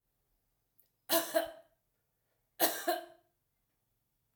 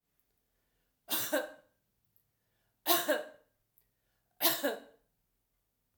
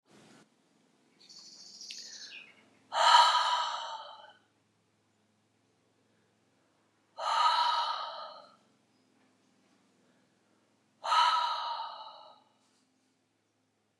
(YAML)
cough_length: 4.4 s
cough_amplitude: 6286
cough_signal_mean_std_ratio: 0.3
three_cough_length: 6.0 s
three_cough_amplitude: 10422
three_cough_signal_mean_std_ratio: 0.32
exhalation_length: 14.0 s
exhalation_amplitude: 12229
exhalation_signal_mean_std_ratio: 0.36
survey_phase: alpha (2021-03-01 to 2021-08-12)
age: 45-64
gender: Female
wearing_mask: 'No'
symptom_none: true
smoker_status: Ex-smoker
respiratory_condition_asthma: false
respiratory_condition_other: false
recruitment_source: REACT
submission_delay: 2 days
covid_test_result: Negative
covid_test_method: RT-qPCR